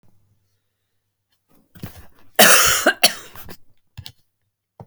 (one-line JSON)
{"cough_length": "4.9 s", "cough_amplitude": 32768, "cough_signal_mean_std_ratio": 0.29, "survey_phase": "alpha (2021-03-01 to 2021-08-12)", "age": "65+", "gender": "Male", "wearing_mask": "No", "symptom_none": true, "smoker_status": "Never smoked", "respiratory_condition_asthma": false, "respiratory_condition_other": false, "recruitment_source": "REACT", "submission_delay": "4 days", "covid_test_method": "RT-qPCR", "covid_ct_value": 35.0, "covid_ct_gene": "N gene"}